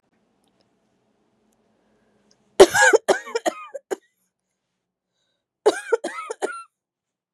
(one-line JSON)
{"cough_length": "7.3 s", "cough_amplitude": 32768, "cough_signal_mean_std_ratio": 0.24, "survey_phase": "beta (2021-08-13 to 2022-03-07)", "age": "45-64", "gender": "Female", "wearing_mask": "No", "symptom_cough_any": true, "symptom_new_continuous_cough": true, "symptom_shortness_of_breath": true, "symptom_abdominal_pain": true, "symptom_fatigue": true, "symptom_fever_high_temperature": true, "symptom_headache": true, "symptom_change_to_sense_of_smell_or_taste": true, "symptom_loss_of_taste": true, "symptom_onset": "5 days", "smoker_status": "Never smoked", "respiratory_condition_asthma": false, "respiratory_condition_other": false, "recruitment_source": "Test and Trace", "submission_delay": "2 days", "covid_test_result": "Positive", "covid_test_method": "ePCR"}